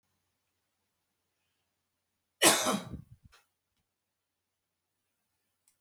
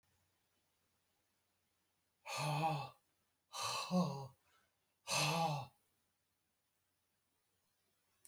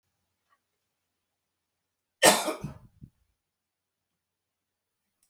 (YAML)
three_cough_length: 5.8 s
three_cough_amplitude: 13022
three_cough_signal_mean_std_ratio: 0.2
exhalation_length: 8.3 s
exhalation_amplitude: 2083
exhalation_signal_mean_std_ratio: 0.39
cough_length: 5.3 s
cough_amplitude: 22004
cough_signal_mean_std_ratio: 0.17
survey_phase: beta (2021-08-13 to 2022-03-07)
age: 65+
gender: Male
wearing_mask: 'No'
symptom_none: true
smoker_status: Never smoked
respiratory_condition_asthma: false
respiratory_condition_other: false
recruitment_source: REACT
submission_delay: 2 days
covid_test_result: Negative
covid_test_method: RT-qPCR